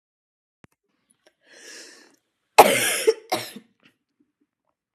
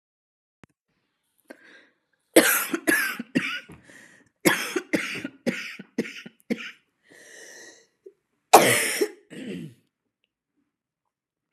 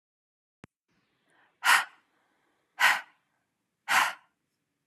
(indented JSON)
{
  "three_cough_length": "4.9 s",
  "three_cough_amplitude": 32768,
  "three_cough_signal_mean_std_ratio": 0.23,
  "cough_length": "11.5 s",
  "cough_amplitude": 32767,
  "cough_signal_mean_std_ratio": 0.32,
  "exhalation_length": "4.9 s",
  "exhalation_amplitude": 14256,
  "exhalation_signal_mean_std_ratio": 0.28,
  "survey_phase": "beta (2021-08-13 to 2022-03-07)",
  "age": "18-44",
  "gender": "Female",
  "wearing_mask": "No",
  "symptom_new_continuous_cough": true,
  "symptom_shortness_of_breath": true,
  "symptom_fatigue": true,
  "symptom_onset": "3 days",
  "smoker_status": "Never smoked",
  "respiratory_condition_asthma": false,
  "respiratory_condition_other": false,
  "recruitment_source": "Test and Trace",
  "submission_delay": "1 day",
  "covid_test_result": "Positive",
  "covid_test_method": "RT-qPCR",
  "covid_ct_value": 31.4,
  "covid_ct_gene": "N gene"
}